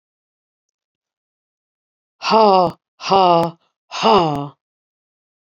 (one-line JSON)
{"exhalation_length": "5.5 s", "exhalation_amplitude": 28243, "exhalation_signal_mean_std_ratio": 0.36, "survey_phase": "beta (2021-08-13 to 2022-03-07)", "age": "45-64", "gender": "Female", "wearing_mask": "No", "symptom_cough_any": true, "smoker_status": "Never smoked", "respiratory_condition_asthma": true, "respiratory_condition_other": false, "recruitment_source": "REACT", "submission_delay": "2 days", "covid_test_result": "Negative", "covid_test_method": "RT-qPCR", "influenza_a_test_result": "Negative", "influenza_b_test_result": "Negative"}